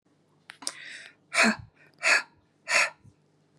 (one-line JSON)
{"exhalation_length": "3.6 s", "exhalation_amplitude": 14185, "exhalation_signal_mean_std_ratio": 0.36, "survey_phase": "beta (2021-08-13 to 2022-03-07)", "age": "45-64", "gender": "Female", "wearing_mask": "No", "symptom_none": true, "smoker_status": "Ex-smoker", "respiratory_condition_asthma": true, "respiratory_condition_other": false, "recruitment_source": "REACT", "submission_delay": "1 day", "covid_test_result": "Negative", "covid_test_method": "RT-qPCR", "influenza_a_test_result": "Negative", "influenza_b_test_result": "Negative"}